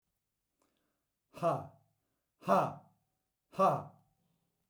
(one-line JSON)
{"exhalation_length": "4.7 s", "exhalation_amplitude": 6193, "exhalation_signal_mean_std_ratio": 0.3, "survey_phase": "beta (2021-08-13 to 2022-03-07)", "age": "65+", "gender": "Male", "wearing_mask": "No", "symptom_none": true, "smoker_status": "Never smoked", "respiratory_condition_asthma": false, "respiratory_condition_other": false, "recruitment_source": "REACT", "submission_delay": "1 day", "covid_test_result": "Negative", "covid_test_method": "RT-qPCR"}